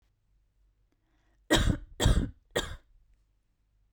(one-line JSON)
{"three_cough_length": "3.9 s", "three_cough_amplitude": 11633, "three_cough_signal_mean_std_ratio": 0.33, "survey_phase": "beta (2021-08-13 to 2022-03-07)", "age": "18-44", "gender": "Female", "wearing_mask": "Yes", "symptom_sore_throat": true, "smoker_status": "Current smoker (1 to 10 cigarettes per day)", "respiratory_condition_asthma": false, "respiratory_condition_other": false, "recruitment_source": "REACT", "submission_delay": "0 days", "covid_test_result": "Negative", "covid_test_method": "RT-qPCR", "influenza_a_test_result": "Negative", "influenza_b_test_result": "Negative"}